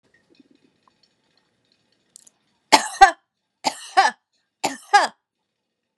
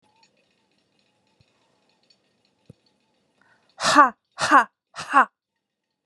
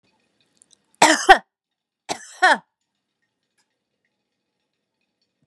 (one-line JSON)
{"three_cough_length": "6.0 s", "three_cough_amplitude": 32768, "three_cough_signal_mean_std_ratio": 0.23, "exhalation_length": "6.1 s", "exhalation_amplitude": 30544, "exhalation_signal_mean_std_ratio": 0.24, "cough_length": "5.5 s", "cough_amplitude": 32767, "cough_signal_mean_std_ratio": 0.21, "survey_phase": "beta (2021-08-13 to 2022-03-07)", "age": "45-64", "gender": "Female", "wearing_mask": "No", "symptom_none": true, "smoker_status": "Never smoked", "respiratory_condition_asthma": false, "respiratory_condition_other": false, "recruitment_source": "REACT", "submission_delay": "3 days", "covid_test_result": "Negative", "covid_test_method": "RT-qPCR"}